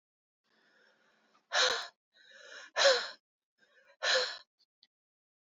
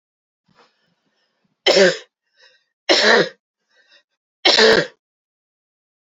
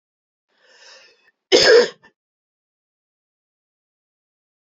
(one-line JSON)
{"exhalation_length": "5.5 s", "exhalation_amplitude": 7075, "exhalation_signal_mean_std_ratio": 0.32, "three_cough_length": "6.1 s", "three_cough_amplitude": 31614, "three_cough_signal_mean_std_ratio": 0.34, "cough_length": "4.7 s", "cough_amplitude": 30340, "cough_signal_mean_std_ratio": 0.23, "survey_phase": "alpha (2021-03-01 to 2021-08-12)", "age": "45-64", "gender": "Female", "wearing_mask": "No", "symptom_none": true, "smoker_status": "Ex-smoker", "respiratory_condition_asthma": false, "respiratory_condition_other": false, "recruitment_source": "REACT", "submission_delay": "1 day", "covid_test_result": "Negative", "covid_test_method": "RT-qPCR"}